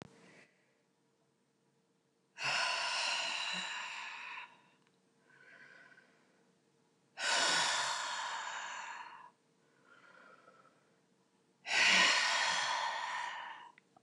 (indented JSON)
{
  "exhalation_length": "14.0 s",
  "exhalation_amplitude": 5577,
  "exhalation_signal_mean_std_ratio": 0.5,
  "survey_phase": "beta (2021-08-13 to 2022-03-07)",
  "age": "45-64",
  "gender": "Female",
  "wearing_mask": "No",
  "symptom_none": true,
  "smoker_status": "Never smoked",
  "respiratory_condition_asthma": true,
  "respiratory_condition_other": false,
  "recruitment_source": "REACT",
  "submission_delay": "1 day",
  "covid_test_result": "Negative",
  "covid_test_method": "RT-qPCR",
  "influenza_a_test_result": "Negative",
  "influenza_b_test_result": "Negative"
}